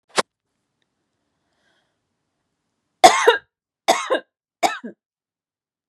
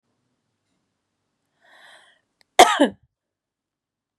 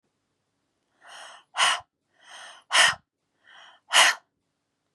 {"three_cough_length": "5.9 s", "three_cough_amplitude": 32768, "three_cough_signal_mean_std_ratio": 0.23, "cough_length": "4.2 s", "cough_amplitude": 32768, "cough_signal_mean_std_ratio": 0.17, "exhalation_length": "4.9 s", "exhalation_amplitude": 22954, "exhalation_signal_mean_std_ratio": 0.3, "survey_phase": "beta (2021-08-13 to 2022-03-07)", "age": "18-44", "gender": "Female", "wearing_mask": "No", "symptom_none": true, "smoker_status": "Ex-smoker", "respiratory_condition_asthma": true, "respiratory_condition_other": false, "recruitment_source": "REACT", "submission_delay": "2 days", "covid_test_result": "Negative", "covid_test_method": "RT-qPCR", "influenza_a_test_result": "Negative", "influenza_b_test_result": "Negative"}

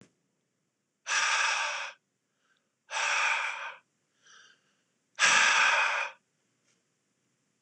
{"exhalation_length": "7.6 s", "exhalation_amplitude": 10492, "exhalation_signal_mean_std_ratio": 0.46, "survey_phase": "beta (2021-08-13 to 2022-03-07)", "age": "45-64", "gender": "Male", "wearing_mask": "No", "symptom_cough_any": true, "symptom_runny_or_blocked_nose": true, "smoker_status": "Never smoked", "respiratory_condition_asthma": false, "respiratory_condition_other": false, "recruitment_source": "Test and Trace", "submission_delay": "2 days", "covid_test_result": "Positive", "covid_test_method": "RT-qPCR", "covid_ct_value": 27.6, "covid_ct_gene": "ORF1ab gene"}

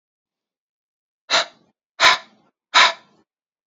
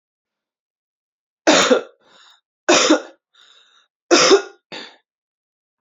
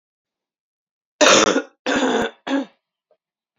{"exhalation_length": "3.7 s", "exhalation_amplitude": 29445, "exhalation_signal_mean_std_ratio": 0.28, "three_cough_length": "5.8 s", "three_cough_amplitude": 32262, "three_cough_signal_mean_std_ratio": 0.34, "cough_length": "3.6 s", "cough_amplitude": 32061, "cough_signal_mean_std_ratio": 0.4, "survey_phase": "beta (2021-08-13 to 2022-03-07)", "age": "18-44", "gender": "Female", "wearing_mask": "No", "symptom_cough_any": true, "symptom_runny_or_blocked_nose": true, "symptom_shortness_of_breath": true, "symptom_fatigue": true, "symptom_fever_high_temperature": true, "symptom_headache": true, "smoker_status": "Never smoked", "respiratory_condition_asthma": false, "respiratory_condition_other": false, "recruitment_source": "Test and Trace", "submission_delay": "1 day", "covid_test_result": "Positive", "covid_test_method": "RT-qPCR", "covid_ct_value": 27.0, "covid_ct_gene": "ORF1ab gene", "covid_ct_mean": 27.4, "covid_viral_load": "1000 copies/ml", "covid_viral_load_category": "Minimal viral load (< 10K copies/ml)"}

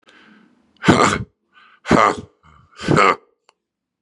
{"exhalation_length": "4.0 s", "exhalation_amplitude": 32768, "exhalation_signal_mean_std_ratio": 0.37, "survey_phase": "beta (2021-08-13 to 2022-03-07)", "age": "45-64", "gender": "Male", "wearing_mask": "No", "symptom_cough_any": true, "symptom_runny_or_blocked_nose": true, "symptom_shortness_of_breath": true, "symptom_sore_throat": true, "symptom_abdominal_pain": true, "symptom_fatigue": true, "symptom_fever_high_temperature": true, "symptom_headache": true, "symptom_change_to_sense_of_smell_or_taste": true, "symptom_loss_of_taste": true, "symptom_other": true, "symptom_onset": "4 days", "smoker_status": "Ex-smoker", "respiratory_condition_asthma": false, "respiratory_condition_other": false, "recruitment_source": "Test and Trace", "submission_delay": "1 day", "covid_test_result": "Positive", "covid_test_method": "RT-qPCR", "covid_ct_value": 17.4, "covid_ct_gene": "ORF1ab gene", "covid_ct_mean": 17.7, "covid_viral_load": "1500000 copies/ml", "covid_viral_load_category": "High viral load (>1M copies/ml)"}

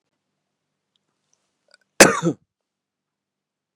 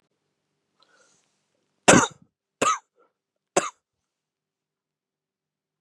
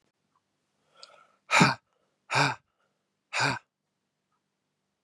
{"cough_length": "3.8 s", "cough_amplitude": 32768, "cough_signal_mean_std_ratio": 0.17, "three_cough_length": "5.8 s", "three_cough_amplitude": 32419, "three_cough_signal_mean_std_ratio": 0.19, "exhalation_length": "5.0 s", "exhalation_amplitude": 17652, "exhalation_signal_mean_std_ratio": 0.27, "survey_phase": "beta (2021-08-13 to 2022-03-07)", "age": "45-64", "gender": "Male", "wearing_mask": "No", "symptom_none": true, "smoker_status": "Ex-smoker", "respiratory_condition_asthma": false, "respiratory_condition_other": false, "recruitment_source": "REACT", "submission_delay": "4 days", "covid_test_result": "Negative", "covid_test_method": "RT-qPCR", "influenza_a_test_result": "Negative", "influenza_b_test_result": "Negative"}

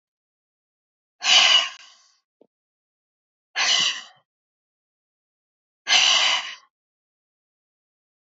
{"exhalation_length": "8.4 s", "exhalation_amplitude": 22273, "exhalation_signal_mean_std_ratio": 0.33, "survey_phase": "beta (2021-08-13 to 2022-03-07)", "age": "45-64", "gender": "Female", "wearing_mask": "No", "symptom_none": true, "smoker_status": "Never smoked", "respiratory_condition_asthma": false, "respiratory_condition_other": false, "recruitment_source": "REACT", "submission_delay": "1 day", "covid_test_result": "Negative", "covid_test_method": "RT-qPCR"}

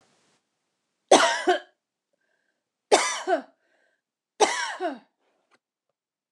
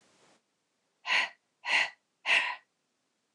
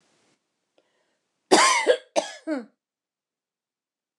{"three_cough_length": "6.3 s", "three_cough_amplitude": 23723, "three_cough_signal_mean_std_ratio": 0.31, "exhalation_length": "3.3 s", "exhalation_amplitude": 7557, "exhalation_signal_mean_std_ratio": 0.37, "cough_length": "4.2 s", "cough_amplitude": 27224, "cough_signal_mean_std_ratio": 0.3, "survey_phase": "beta (2021-08-13 to 2022-03-07)", "age": "45-64", "gender": "Female", "wearing_mask": "No", "symptom_none": true, "smoker_status": "Ex-smoker", "respiratory_condition_asthma": false, "respiratory_condition_other": false, "recruitment_source": "REACT", "submission_delay": "2 days", "covid_test_result": "Negative", "covid_test_method": "RT-qPCR"}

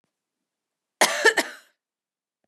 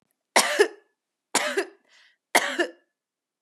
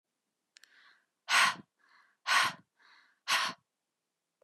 {"cough_length": "2.5 s", "cough_amplitude": 20975, "cough_signal_mean_std_ratio": 0.27, "three_cough_length": "3.4 s", "three_cough_amplitude": 22922, "three_cough_signal_mean_std_ratio": 0.36, "exhalation_length": "4.4 s", "exhalation_amplitude": 7087, "exhalation_signal_mean_std_ratio": 0.32, "survey_phase": "beta (2021-08-13 to 2022-03-07)", "age": "18-44", "gender": "Female", "wearing_mask": "No", "symptom_none": true, "smoker_status": "Never smoked", "respiratory_condition_asthma": false, "respiratory_condition_other": false, "recruitment_source": "REACT", "submission_delay": "1 day", "covid_test_result": "Negative", "covid_test_method": "RT-qPCR", "influenza_a_test_result": "Negative", "influenza_b_test_result": "Negative"}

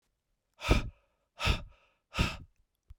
{"exhalation_length": "3.0 s", "exhalation_amplitude": 10055, "exhalation_signal_mean_std_ratio": 0.34, "survey_phase": "beta (2021-08-13 to 2022-03-07)", "age": "45-64", "gender": "Male", "wearing_mask": "No", "symptom_cough_any": true, "symptom_runny_or_blocked_nose": true, "symptom_headache": true, "smoker_status": "Ex-smoker", "respiratory_condition_asthma": false, "respiratory_condition_other": false, "recruitment_source": "Test and Trace", "submission_delay": "1 day", "covid_test_result": "Positive", "covid_test_method": "LFT"}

